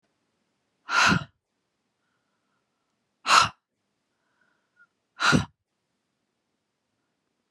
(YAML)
exhalation_length: 7.5 s
exhalation_amplitude: 23887
exhalation_signal_mean_std_ratio: 0.24
survey_phase: beta (2021-08-13 to 2022-03-07)
age: 18-44
gender: Female
wearing_mask: 'No'
symptom_sore_throat: true
symptom_onset: 2 days
smoker_status: Ex-smoker
respiratory_condition_asthma: true
respiratory_condition_other: false
recruitment_source: REACT
submission_delay: 2 days
covid_test_result: Negative
covid_test_method: RT-qPCR